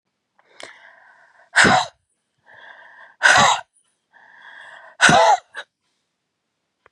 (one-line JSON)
{"exhalation_length": "6.9 s", "exhalation_amplitude": 31814, "exhalation_signal_mean_std_ratio": 0.33, "survey_phase": "beta (2021-08-13 to 2022-03-07)", "age": "45-64", "gender": "Female", "wearing_mask": "No", "symptom_none": true, "symptom_onset": "8 days", "smoker_status": "Never smoked", "respiratory_condition_asthma": false, "respiratory_condition_other": false, "recruitment_source": "REACT", "submission_delay": "1 day", "covid_test_result": "Negative", "covid_test_method": "RT-qPCR"}